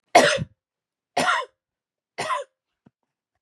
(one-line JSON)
{"three_cough_length": "3.4 s", "three_cough_amplitude": 29599, "three_cough_signal_mean_std_ratio": 0.33, "survey_phase": "beta (2021-08-13 to 2022-03-07)", "age": "45-64", "gender": "Female", "wearing_mask": "No", "symptom_runny_or_blocked_nose": true, "symptom_fatigue": true, "smoker_status": "Never smoked", "respiratory_condition_asthma": false, "respiratory_condition_other": false, "recruitment_source": "Test and Trace", "submission_delay": "1 day", "covid_test_result": "Positive", "covid_test_method": "RT-qPCR", "covid_ct_value": 28.4, "covid_ct_gene": "N gene"}